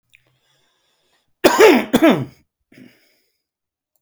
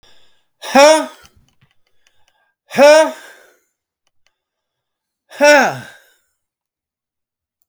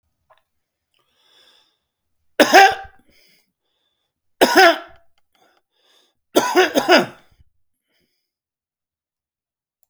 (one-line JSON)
{"cough_length": "4.0 s", "cough_amplitude": 32768, "cough_signal_mean_std_ratio": 0.31, "exhalation_length": "7.7 s", "exhalation_amplitude": 32768, "exhalation_signal_mean_std_ratio": 0.31, "three_cough_length": "9.9 s", "three_cough_amplitude": 32768, "three_cough_signal_mean_std_ratio": 0.26, "survey_phase": "beta (2021-08-13 to 2022-03-07)", "age": "65+", "gender": "Male", "wearing_mask": "No", "symptom_none": true, "smoker_status": "Ex-smoker", "respiratory_condition_asthma": true, "respiratory_condition_other": true, "recruitment_source": "REACT", "submission_delay": "2 days", "covid_test_result": "Negative", "covid_test_method": "RT-qPCR", "influenza_a_test_result": "Negative", "influenza_b_test_result": "Negative"}